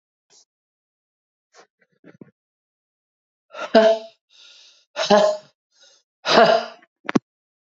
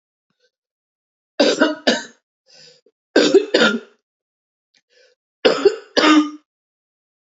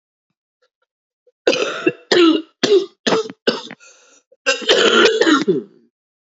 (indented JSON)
{
  "exhalation_length": "7.7 s",
  "exhalation_amplitude": 27880,
  "exhalation_signal_mean_std_ratio": 0.29,
  "three_cough_length": "7.3 s",
  "three_cough_amplitude": 29885,
  "three_cough_signal_mean_std_ratio": 0.36,
  "cough_length": "6.4 s",
  "cough_amplitude": 31267,
  "cough_signal_mean_std_ratio": 0.49,
  "survey_phase": "beta (2021-08-13 to 2022-03-07)",
  "age": "45-64",
  "gender": "Female",
  "wearing_mask": "No",
  "symptom_cough_any": true,
  "symptom_runny_or_blocked_nose": true,
  "symptom_sore_throat": true,
  "symptom_diarrhoea": true,
  "symptom_headache": true,
  "symptom_onset": "4 days",
  "smoker_status": "Never smoked",
  "respiratory_condition_asthma": true,
  "respiratory_condition_other": false,
  "recruitment_source": "Test and Trace",
  "submission_delay": "2 days",
  "covid_test_result": "Positive",
  "covid_test_method": "RT-qPCR"
}